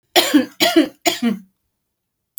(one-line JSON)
{"three_cough_length": "2.4 s", "three_cough_amplitude": 32221, "three_cough_signal_mean_std_ratio": 0.45, "survey_phase": "beta (2021-08-13 to 2022-03-07)", "age": "65+", "gender": "Female", "wearing_mask": "No", "symptom_none": true, "smoker_status": "Current smoker (1 to 10 cigarettes per day)", "respiratory_condition_asthma": false, "respiratory_condition_other": false, "recruitment_source": "REACT", "submission_delay": "1 day", "covid_test_result": "Negative", "covid_test_method": "RT-qPCR"}